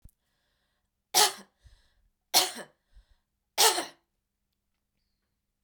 {
  "three_cough_length": "5.6 s",
  "three_cough_amplitude": 15032,
  "three_cough_signal_mean_std_ratio": 0.25,
  "survey_phase": "beta (2021-08-13 to 2022-03-07)",
  "age": "45-64",
  "gender": "Female",
  "wearing_mask": "No",
  "symptom_none": true,
  "symptom_onset": "11 days",
  "smoker_status": "Never smoked",
  "respiratory_condition_asthma": false,
  "respiratory_condition_other": false,
  "recruitment_source": "REACT",
  "submission_delay": "-1 day",
  "covid_test_result": "Negative",
  "covid_test_method": "RT-qPCR",
  "influenza_a_test_result": "Negative",
  "influenza_b_test_result": "Negative"
}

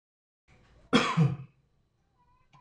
{
  "cough_length": "2.6 s",
  "cough_amplitude": 10853,
  "cough_signal_mean_std_ratio": 0.32,
  "survey_phase": "beta (2021-08-13 to 2022-03-07)",
  "age": "45-64",
  "gender": "Male",
  "wearing_mask": "No",
  "symptom_none": true,
  "smoker_status": "Ex-smoker",
  "respiratory_condition_asthma": false,
  "respiratory_condition_other": false,
  "recruitment_source": "REACT",
  "submission_delay": "3 days",
  "covid_test_result": "Negative",
  "covid_test_method": "RT-qPCR",
  "influenza_a_test_result": "Negative",
  "influenza_b_test_result": "Negative"
}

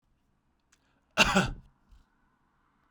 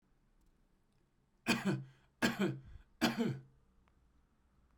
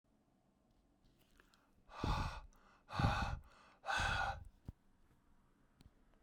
{
  "cough_length": "2.9 s",
  "cough_amplitude": 14690,
  "cough_signal_mean_std_ratio": 0.26,
  "three_cough_length": "4.8 s",
  "three_cough_amplitude": 4324,
  "three_cough_signal_mean_std_ratio": 0.38,
  "exhalation_length": "6.2 s",
  "exhalation_amplitude": 3166,
  "exhalation_signal_mean_std_ratio": 0.42,
  "survey_phase": "beta (2021-08-13 to 2022-03-07)",
  "age": "45-64",
  "gender": "Male",
  "wearing_mask": "No",
  "symptom_none": true,
  "symptom_onset": "12 days",
  "smoker_status": "Never smoked",
  "respiratory_condition_asthma": false,
  "respiratory_condition_other": false,
  "recruitment_source": "REACT",
  "submission_delay": "12 days",
  "covid_test_result": "Negative",
  "covid_test_method": "RT-qPCR"
}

